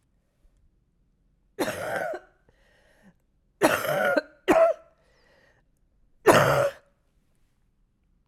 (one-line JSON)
{"three_cough_length": "8.3 s", "three_cough_amplitude": 24914, "three_cough_signal_mean_std_ratio": 0.35, "survey_phase": "alpha (2021-03-01 to 2021-08-12)", "age": "45-64", "gender": "Female", "wearing_mask": "No", "symptom_cough_any": true, "symptom_shortness_of_breath": true, "symptom_fatigue": true, "symptom_headache": true, "symptom_change_to_sense_of_smell_or_taste": true, "symptom_loss_of_taste": true, "smoker_status": "Prefer not to say", "respiratory_condition_asthma": false, "respiratory_condition_other": false, "recruitment_source": "Test and Trace", "submission_delay": "2 days", "covid_test_result": "Positive", "covid_test_method": "RT-qPCR"}